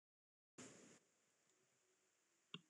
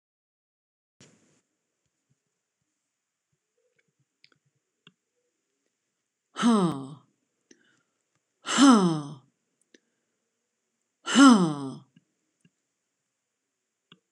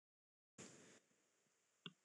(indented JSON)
{
  "cough_length": "2.7 s",
  "cough_amplitude": 414,
  "cough_signal_mean_std_ratio": 0.35,
  "exhalation_length": "14.1 s",
  "exhalation_amplitude": 19411,
  "exhalation_signal_mean_std_ratio": 0.24,
  "three_cough_length": "2.0 s",
  "three_cough_amplitude": 443,
  "three_cough_signal_mean_std_ratio": 0.37,
  "survey_phase": "beta (2021-08-13 to 2022-03-07)",
  "age": "65+",
  "gender": "Female",
  "wearing_mask": "No",
  "symptom_none": true,
  "smoker_status": "Never smoked",
  "respiratory_condition_asthma": false,
  "respiratory_condition_other": false,
  "recruitment_source": "REACT",
  "submission_delay": "3 days",
  "covid_test_result": "Negative",
  "covid_test_method": "RT-qPCR"
}